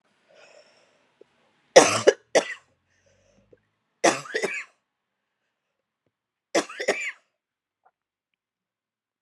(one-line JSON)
{"three_cough_length": "9.2 s", "three_cough_amplitude": 32768, "three_cough_signal_mean_std_ratio": 0.22, "survey_phase": "alpha (2021-03-01 to 2021-08-12)", "age": "45-64", "gender": "Female", "wearing_mask": "No", "symptom_diarrhoea": true, "symptom_headache": true, "symptom_change_to_sense_of_smell_or_taste": true, "smoker_status": "Ex-smoker", "respiratory_condition_asthma": false, "respiratory_condition_other": false, "recruitment_source": "REACT", "submission_delay": "7 days", "covid_test_result": "Negative", "covid_test_method": "RT-qPCR"}